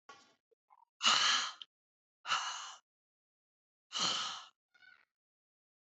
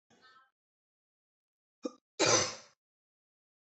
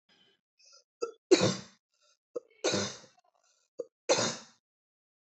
{
  "exhalation_length": "5.9 s",
  "exhalation_amplitude": 7548,
  "exhalation_signal_mean_std_ratio": 0.36,
  "cough_length": "3.7 s",
  "cough_amplitude": 7477,
  "cough_signal_mean_std_ratio": 0.24,
  "three_cough_length": "5.4 s",
  "three_cough_amplitude": 11641,
  "three_cough_signal_mean_std_ratio": 0.3,
  "survey_phase": "beta (2021-08-13 to 2022-03-07)",
  "age": "18-44",
  "gender": "Female",
  "wearing_mask": "No",
  "symptom_cough_any": true,
  "symptom_runny_or_blocked_nose": true,
  "symptom_fatigue": true,
  "symptom_headache": true,
  "symptom_change_to_sense_of_smell_or_taste": true,
  "symptom_loss_of_taste": true,
  "smoker_status": "Ex-smoker",
  "respiratory_condition_asthma": false,
  "respiratory_condition_other": false,
  "recruitment_source": "Test and Trace",
  "submission_delay": "1 day",
  "covid_test_result": "Positive",
  "covid_test_method": "RT-qPCR"
}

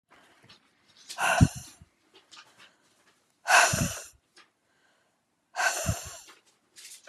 {
  "exhalation_length": "7.1 s",
  "exhalation_amplitude": 18805,
  "exhalation_signal_mean_std_ratio": 0.31,
  "survey_phase": "beta (2021-08-13 to 2022-03-07)",
  "age": "45-64",
  "gender": "Female",
  "wearing_mask": "No",
  "symptom_none": true,
  "smoker_status": "Current smoker (1 to 10 cigarettes per day)",
  "respiratory_condition_asthma": false,
  "respiratory_condition_other": false,
  "recruitment_source": "REACT",
  "submission_delay": "2 days",
  "covid_test_result": "Negative",
  "covid_test_method": "RT-qPCR",
  "influenza_a_test_result": "Negative",
  "influenza_b_test_result": "Negative"
}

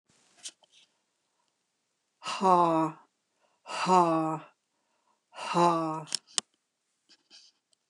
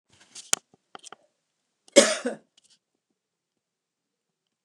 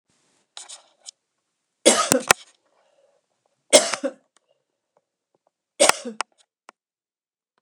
{
  "exhalation_length": "7.9 s",
  "exhalation_amplitude": 16955,
  "exhalation_signal_mean_std_ratio": 0.36,
  "cough_length": "4.6 s",
  "cough_amplitude": 29204,
  "cough_signal_mean_std_ratio": 0.17,
  "three_cough_length": "7.6 s",
  "three_cough_amplitude": 29204,
  "three_cough_signal_mean_std_ratio": 0.22,
  "survey_phase": "alpha (2021-03-01 to 2021-08-12)",
  "age": "65+",
  "gender": "Female",
  "wearing_mask": "No",
  "symptom_none": true,
  "smoker_status": "Ex-smoker",
  "respiratory_condition_asthma": false,
  "respiratory_condition_other": false,
  "recruitment_source": "REACT",
  "submission_delay": "2 days",
  "covid_test_result": "Negative",
  "covid_test_method": "RT-qPCR"
}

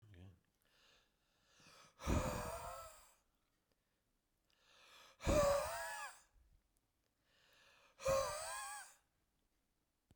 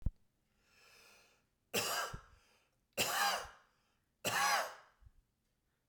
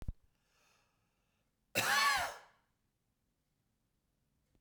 {
  "exhalation_length": "10.2 s",
  "exhalation_amplitude": 2308,
  "exhalation_signal_mean_std_ratio": 0.37,
  "three_cough_length": "5.9 s",
  "three_cough_amplitude": 2873,
  "three_cough_signal_mean_std_ratio": 0.41,
  "cough_length": "4.6 s",
  "cough_amplitude": 3493,
  "cough_signal_mean_std_ratio": 0.31,
  "survey_phase": "beta (2021-08-13 to 2022-03-07)",
  "age": "45-64",
  "gender": "Male",
  "wearing_mask": "No",
  "symptom_none": true,
  "smoker_status": "Never smoked",
  "respiratory_condition_asthma": false,
  "respiratory_condition_other": false,
  "recruitment_source": "REACT",
  "submission_delay": "3 days",
  "covid_test_result": "Negative",
  "covid_test_method": "RT-qPCR",
  "influenza_a_test_result": "Negative",
  "influenza_b_test_result": "Negative"
}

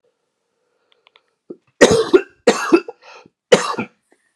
{
  "three_cough_length": "4.4 s",
  "three_cough_amplitude": 32768,
  "three_cough_signal_mean_std_ratio": 0.32,
  "survey_phase": "beta (2021-08-13 to 2022-03-07)",
  "age": "45-64",
  "gender": "Male",
  "wearing_mask": "No",
  "symptom_cough_any": true,
  "symptom_runny_or_blocked_nose": true,
  "symptom_onset": "2 days",
  "smoker_status": "Never smoked",
  "respiratory_condition_asthma": false,
  "respiratory_condition_other": false,
  "recruitment_source": "REACT",
  "submission_delay": "0 days",
  "covid_test_result": "Negative",
  "covid_test_method": "RT-qPCR"
}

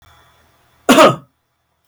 {
  "cough_length": "1.9 s",
  "cough_amplitude": 32768,
  "cough_signal_mean_std_ratio": 0.31,
  "survey_phase": "beta (2021-08-13 to 2022-03-07)",
  "age": "65+",
  "gender": "Male",
  "wearing_mask": "No",
  "symptom_runny_or_blocked_nose": true,
  "symptom_onset": "4 days",
  "smoker_status": "Never smoked",
  "respiratory_condition_asthma": false,
  "respiratory_condition_other": false,
  "recruitment_source": "REACT",
  "submission_delay": "1 day",
  "covid_test_result": "Negative",
  "covid_test_method": "RT-qPCR",
  "influenza_a_test_result": "Unknown/Void",
  "influenza_b_test_result": "Unknown/Void"
}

